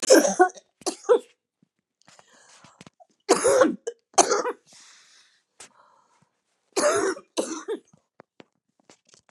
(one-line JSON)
{"three_cough_length": "9.3 s", "three_cough_amplitude": 29076, "three_cough_signal_mean_std_ratio": 0.34, "survey_phase": "beta (2021-08-13 to 2022-03-07)", "age": "65+", "gender": "Female", "wearing_mask": "No", "symptom_cough_any": true, "symptom_runny_or_blocked_nose": true, "symptom_shortness_of_breath": true, "symptom_fatigue": true, "symptom_onset": "7 days", "smoker_status": "Ex-smoker", "respiratory_condition_asthma": true, "respiratory_condition_other": false, "recruitment_source": "REACT", "submission_delay": "1 day", "covid_test_result": "Negative", "covid_test_method": "RT-qPCR", "influenza_a_test_result": "Negative", "influenza_b_test_result": "Negative"}